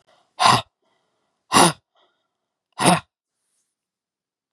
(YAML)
exhalation_length: 4.5 s
exhalation_amplitude: 32614
exhalation_signal_mean_std_ratio: 0.27
survey_phase: beta (2021-08-13 to 2022-03-07)
age: 65+
gender: Female
wearing_mask: 'No'
symptom_cough_any: true
symptom_runny_or_blocked_nose: true
symptom_sore_throat: true
symptom_fatigue: true
symptom_onset: 12 days
smoker_status: Never smoked
respiratory_condition_asthma: false
respiratory_condition_other: false
recruitment_source: REACT
submission_delay: 1 day
covid_test_result: Negative
covid_test_method: RT-qPCR
influenza_a_test_result: Negative
influenza_b_test_result: Negative